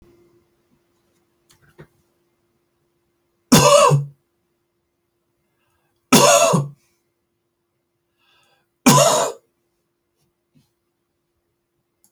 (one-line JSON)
{"three_cough_length": "12.1 s", "three_cough_amplitude": 32768, "three_cough_signal_mean_std_ratio": 0.28, "survey_phase": "alpha (2021-03-01 to 2021-08-12)", "age": "45-64", "gender": "Male", "wearing_mask": "No", "symptom_none": true, "smoker_status": "Never smoked", "respiratory_condition_asthma": false, "respiratory_condition_other": false, "recruitment_source": "REACT", "submission_delay": "3 days", "covid_test_result": "Negative", "covid_test_method": "RT-qPCR"}